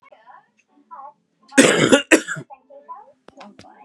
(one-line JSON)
{"cough_length": "3.8 s", "cough_amplitude": 32768, "cough_signal_mean_std_ratio": 0.32, "survey_phase": "beta (2021-08-13 to 2022-03-07)", "age": "18-44", "gender": "Male", "wearing_mask": "No", "symptom_cough_any": true, "symptom_new_continuous_cough": true, "symptom_runny_or_blocked_nose": true, "symptom_sore_throat": true, "symptom_abdominal_pain": true, "symptom_diarrhoea": true, "symptom_fatigue": true, "symptom_fever_high_temperature": true, "symptom_headache": true, "symptom_change_to_sense_of_smell_or_taste": true, "symptom_onset": "3 days", "smoker_status": "Never smoked", "respiratory_condition_asthma": false, "respiratory_condition_other": false, "recruitment_source": "Test and Trace", "submission_delay": "2 days", "covid_test_result": "Positive", "covid_test_method": "RT-qPCR", "covid_ct_value": 17.4, "covid_ct_gene": "N gene"}